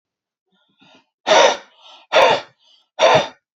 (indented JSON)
{
  "exhalation_length": "3.6 s",
  "exhalation_amplitude": 30229,
  "exhalation_signal_mean_std_ratio": 0.4,
  "survey_phase": "beta (2021-08-13 to 2022-03-07)",
  "age": "45-64",
  "gender": "Male",
  "wearing_mask": "No",
  "symptom_none": true,
  "smoker_status": "Ex-smoker",
  "respiratory_condition_asthma": false,
  "respiratory_condition_other": false,
  "recruitment_source": "REACT",
  "submission_delay": "2 days",
  "covid_test_result": "Negative",
  "covid_test_method": "RT-qPCR",
  "influenza_a_test_result": "Negative",
  "influenza_b_test_result": "Negative"
}